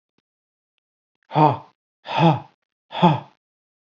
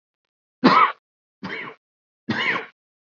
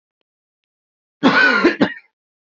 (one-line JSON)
{"exhalation_length": "3.9 s", "exhalation_amplitude": 29062, "exhalation_signal_mean_std_ratio": 0.32, "three_cough_length": "3.2 s", "three_cough_amplitude": 26363, "three_cough_signal_mean_std_ratio": 0.35, "cough_length": "2.5 s", "cough_amplitude": 28568, "cough_signal_mean_std_ratio": 0.41, "survey_phase": "beta (2021-08-13 to 2022-03-07)", "age": "18-44", "gender": "Male", "wearing_mask": "No", "symptom_none": true, "smoker_status": "Never smoked", "respiratory_condition_asthma": false, "respiratory_condition_other": false, "recruitment_source": "REACT", "submission_delay": "0 days", "covid_test_result": "Negative", "covid_test_method": "RT-qPCR", "influenza_a_test_result": "Negative", "influenza_b_test_result": "Negative"}